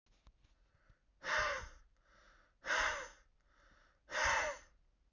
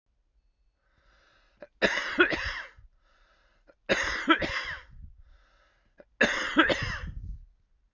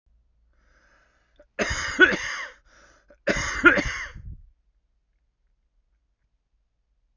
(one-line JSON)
{"exhalation_length": "5.1 s", "exhalation_amplitude": 2309, "exhalation_signal_mean_std_ratio": 0.43, "three_cough_length": "7.9 s", "three_cough_amplitude": 15142, "three_cough_signal_mean_std_ratio": 0.41, "cough_length": "7.2 s", "cough_amplitude": 27940, "cough_signal_mean_std_ratio": 0.3, "survey_phase": "beta (2021-08-13 to 2022-03-07)", "age": "45-64", "gender": "Male", "wearing_mask": "No", "symptom_cough_any": true, "symptom_runny_or_blocked_nose": true, "symptom_shortness_of_breath": true, "symptom_diarrhoea": true, "smoker_status": "Current smoker (11 or more cigarettes per day)", "respiratory_condition_asthma": true, "respiratory_condition_other": false, "recruitment_source": "REACT", "submission_delay": "2 days", "covid_test_result": "Negative", "covid_test_method": "RT-qPCR"}